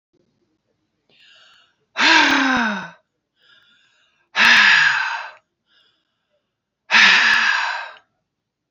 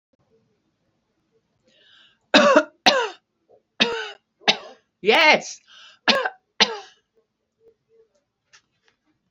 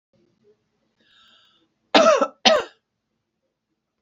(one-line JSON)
{"exhalation_length": "8.7 s", "exhalation_amplitude": 32767, "exhalation_signal_mean_std_ratio": 0.45, "three_cough_length": "9.3 s", "three_cough_amplitude": 32768, "three_cough_signal_mean_std_ratio": 0.3, "cough_length": "4.0 s", "cough_amplitude": 28726, "cough_signal_mean_std_ratio": 0.28, "survey_phase": "beta (2021-08-13 to 2022-03-07)", "age": "65+", "gender": "Female", "wearing_mask": "No", "symptom_change_to_sense_of_smell_or_taste": true, "smoker_status": "Ex-smoker", "respiratory_condition_asthma": false, "respiratory_condition_other": false, "recruitment_source": "REACT", "submission_delay": "7 days", "covid_test_result": "Negative", "covid_test_method": "RT-qPCR", "influenza_a_test_result": "Negative", "influenza_b_test_result": "Negative"}